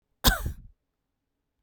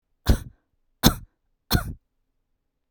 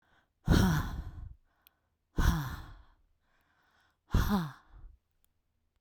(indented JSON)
{
  "cough_length": "1.6 s",
  "cough_amplitude": 20327,
  "cough_signal_mean_std_ratio": 0.28,
  "three_cough_length": "2.9 s",
  "three_cough_amplitude": 32767,
  "three_cough_signal_mean_std_ratio": 0.26,
  "exhalation_length": "5.8 s",
  "exhalation_amplitude": 8325,
  "exhalation_signal_mean_std_ratio": 0.38,
  "survey_phase": "beta (2021-08-13 to 2022-03-07)",
  "age": "45-64",
  "gender": "Female",
  "wearing_mask": "No",
  "symptom_none": true,
  "smoker_status": "Never smoked",
  "respiratory_condition_asthma": false,
  "respiratory_condition_other": false,
  "recruitment_source": "REACT",
  "submission_delay": "1 day",
  "covid_test_result": "Negative",
  "covid_test_method": "RT-qPCR"
}